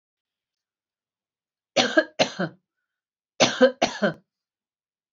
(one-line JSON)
{"cough_length": "5.1 s", "cough_amplitude": 24545, "cough_signal_mean_std_ratio": 0.29, "survey_phase": "beta (2021-08-13 to 2022-03-07)", "age": "45-64", "gender": "Female", "wearing_mask": "No", "symptom_none": true, "smoker_status": "Current smoker (e-cigarettes or vapes only)", "respiratory_condition_asthma": false, "respiratory_condition_other": false, "recruitment_source": "REACT", "submission_delay": "2 days", "covid_test_result": "Negative", "covid_test_method": "RT-qPCR"}